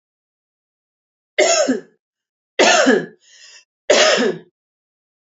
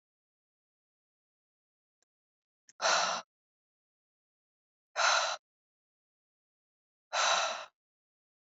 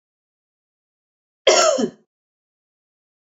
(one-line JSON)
{"three_cough_length": "5.3 s", "three_cough_amplitude": 30551, "three_cough_signal_mean_std_ratio": 0.41, "exhalation_length": "8.4 s", "exhalation_amplitude": 5454, "exhalation_signal_mean_std_ratio": 0.3, "cough_length": "3.3 s", "cough_amplitude": 31564, "cough_signal_mean_std_ratio": 0.27, "survey_phase": "beta (2021-08-13 to 2022-03-07)", "age": "18-44", "gender": "Female", "wearing_mask": "No", "symptom_none": true, "smoker_status": "Never smoked", "respiratory_condition_asthma": false, "respiratory_condition_other": false, "recruitment_source": "REACT", "submission_delay": "10 days", "covid_test_result": "Negative", "covid_test_method": "RT-qPCR", "influenza_a_test_result": "Negative", "influenza_b_test_result": "Negative"}